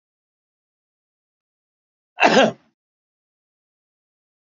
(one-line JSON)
{"cough_length": "4.4 s", "cough_amplitude": 28340, "cough_signal_mean_std_ratio": 0.2, "survey_phase": "beta (2021-08-13 to 2022-03-07)", "age": "65+", "gender": "Male", "wearing_mask": "No", "symptom_none": true, "smoker_status": "Current smoker (1 to 10 cigarettes per day)", "respiratory_condition_asthma": false, "respiratory_condition_other": false, "recruitment_source": "REACT", "submission_delay": "5 days", "covid_test_result": "Negative", "covid_test_method": "RT-qPCR", "influenza_a_test_result": "Negative", "influenza_b_test_result": "Negative"}